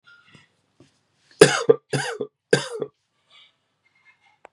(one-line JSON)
{"three_cough_length": "4.5 s", "three_cough_amplitude": 32768, "three_cough_signal_mean_std_ratio": 0.24, "survey_phase": "beta (2021-08-13 to 2022-03-07)", "age": "45-64", "gender": "Male", "wearing_mask": "No", "symptom_cough_any": true, "symptom_runny_or_blocked_nose": true, "symptom_sore_throat": true, "smoker_status": "Ex-smoker", "respiratory_condition_asthma": false, "respiratory_condition_other": false, "recruitment_source": "Test and Trace", "submission_delay": "1 day", "covid_test_result": "Positive", "covid_test_method": "RT-qPCR", "covid_ct_value": 18.6, "covid_ct_gene": "N gene"}